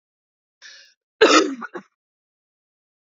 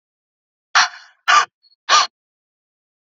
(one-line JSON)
{"cough_length": "3.1 s", "cough_amplitude": 32320, "cough_signal_mean_std_ratio": 0.26, "exhalation_length": "3.1 s", "exhalation_amplitude": 30280, "exhalation_signal_mean_std_ratio": 0.31, "survey_phase": "beta (2021-08-13 to 2022-03-07)", "age": "18-44", "gender": "Female", "wearing_mask": "No", "symptom_cough_any": true, "symptom_runny_or_blocked_nose": true, "symptom_sore_throat": true, "symptom_fatigue": true, "smoker_status": "Never smoked", "respiratory_condition_asthma": false, "respiratory_condition_other": false, "recruitment_source": "Test and Trace", "submission_delay": "2 days", "covid_test_result": "Positive", "covid_test_method": "RT-qPCR", "covid_ct_value": 31.8, "covid_ct_gene": "ORF1ab gene", "covid_ct_mean": 32.6, "covid_viral_load": "20 copies/ml", "covid_viral_load_category": "Minimal viral load (< 10K copies/ml)"}